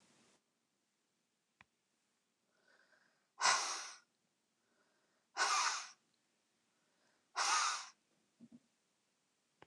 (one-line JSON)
{"exhalation_length": "9.7 s", "exhalation_amplitude": 4148, "exhalation_signal_mean_std_ratio": 0.3, "survey_phase": "beta (2021-08-13 to 2022-03-07)", "age": "45-64", "gender": "Female", "wearing_mask": "No", "symptom_cough_any": true, "symptom_runny_or_blocked_nose": true, "symptom_sore_throat": true, "symptom_diarrhoea": true, "symptom_fatigue": true, "symptom_headache": true, "symptom_change_to_sense_of_smell_or_taste": true, "symptom_loss_of_taste": true, "symptom_onset": "3 days", "smoker_status": "Current smoker (e-cigarettes or vapes only)", "respiratory_condition_asthma": false, "respiratory_condition_other": false, "recruitment_source": "Test and Trace", "submission_delay": "2 days", "covid_test_result": "Positive", "covid_test_method": "RT-qPCR"}